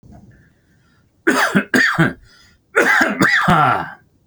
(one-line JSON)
{"cough_length": "4.3 s", "cough_amplitude": 29638, "cough_signal_mean_std_ratio": 0.57, "survey_phase": "beta (2021-08-13 to 2022-03-07)", "age": "45-64", "gender": "Male", "wearing_mask": "No", "symptom_none": true, "smoker_status": "Ex-smoker", "respiratory_condition_asthma": false, "respiratory_condition_other": false, "recruitment_source": "REACT", "submission_delay": "3 days", "covid_test_result": "Negative", "covid_test_method": "RT-qPCR"}